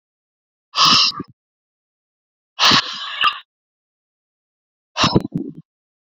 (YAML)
exhalation_length: 6.1 s
exhalation_amplitude: 30658
exhalation_signal_mean_std_ratio: 0.35
survey_phase: beta (2021-08-13 to 2022-03-07)
age: 18-44
gender: Male
wearing_mask: 'No'
symptom_none: true
smoker_status: Current smoker (e-cigarettes or vapes only)
respiratory_condition_asthma: false
respiratory_condition_other: false
recruitment_source: REACT
submission_delay: 4 days
covid_test_result: Negative
covid_test_method: RT-qPCR